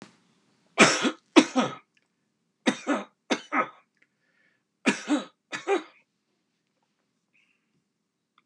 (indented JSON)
{
  "three_cough_length": "8.5 s",
  "three_cough_amplitude": 27784,
  "three_cough_signal_mean_std_ratio": 0.29,
  "survey_phase": "beta (2021-08-13 to 2022-03-07)",
  "age": "65+",
  "gender": "Male",
  "wearing_mask": "No",
  "symptom_none": true,
  "smoker_status": "Never smoked",
  "respiratory_condition_asthma": false,
  "respiratory_condition_other": false,
  "recruitment_source": "REACT",
  "submission_delay": "1 day",
  "covid_test_result": "Negative",
  "covid_test_method": "RT-qPCR",
  "influenza_a_test_result": "Negative",
  "influenza_b_test_result": "Negative"
}